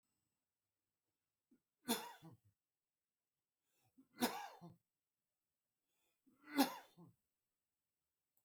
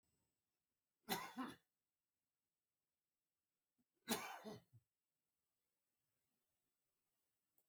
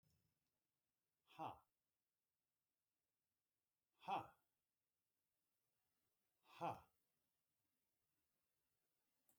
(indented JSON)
{
  "three_cough_length": "8.4 s",
  "three_cough_amplitude": 2805,
  "three_cough_signal_mean_std_ratio": 0.2,
  "cough_length": "7.7 s",
  "cough_amplitude": 1393,
  "cough_signal_mean_std_ratio": 0.24,
  "exhalation_length": "9.4 s",
  "exhalation_amplitude": 527,
  "exhalation_signal_mean_std_ratio": 0.2,
  "survey_phase": "beta (2021-08-13 to 2022-03-07)",
  "age": "65+",
  "gender": "Male",
  "wearing_mask": "No",
  "symptom_fatigue": true,
  "smoker_status": "Ex-smoker",
  "respiratory_condition_asthma": false,
  "respiratory_condition_other": false,
  "recruitment_source": "REACT",
  "submission_delay": "1 day",
  "covid_test_result": "Negative",
  "covid_test_method": "RT-qPCR",
  "influenza_a_test_result": "Unknown/Void",
  "influenza_b_test_result": "Unknown/Void"
}